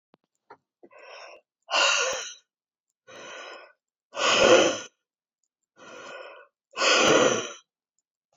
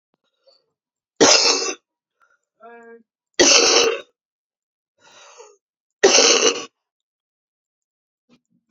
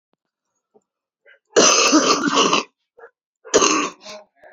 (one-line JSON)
{"exhalation_length": "8.4 s", "exhalation_amplitude": 18603, "exhalation_signal_mean_std_ratio": 0.39, "three_cough_length": "8.7 s", "three_cough_amplitude": 32768, "three_cough_signal_mean_std_ratio": 0.34, "cough_length": "4.5 s", "cough_amplitude": 32768, "cough_signal_mean_std_ratio": 0.46, "survey_phase": "beta (2021-08-13 to 2022-03-07)", "age": "45-64", "gender": "Female", "wearing_mask": "No", "symptom_cough_any": true, "symptom_new_continuous_cough": true, "symptom_runny_or_blocked_nose": true, "symptom_shortness_of_breath": true, "symptom_fatigue": true, "symptom_fever_high_temperature": true, "symptom_headache": true, "symptom_change_to_sense_of_smell_or_taste": true, "symptom_loss_of_taste": true, "smoker_status": "Current smoker (1 to 10 cigarettes per day)", "respiratory_condition_asthma": false, "respiratory_condition_other": false, "recruitment_source": "Test and Trace", "submission_delay": "2 days", "covid_test_result": "Positive", "covid_test_method": "LFT"}